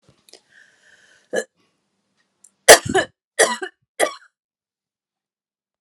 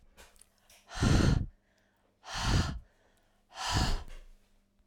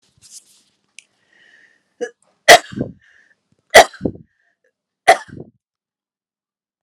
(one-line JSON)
{"cough_length": "5.8 s", "cough_amplitude": 32768, "cough_signal_mean_std_ratio": 0.2, "exhalation_length": "4.9 s", "exhalation_amplitude": 7131, "exhalation_signal_mean_std_ratio": 0.45, "three_cough_length": "6.8 s", "three_cough_amplitude": 32768, "three_cough_signal_mean_std_ratio": 0.19, "survey_phase": "alpha (2021-03-01 to 2021-08-12)", "age": "45-64", "gender": "Female", "wearing_mask": "No", "symptom_none": true, "smoker_status": "Ex-smoker", "respiratory_condition_asthma": true, "respiratory_condition_other": false, "recruitment_source": "REACT", "submission_delay": "2 days", "covid_test_result": "Negative", "covid_test_method": "RT-qPCR"}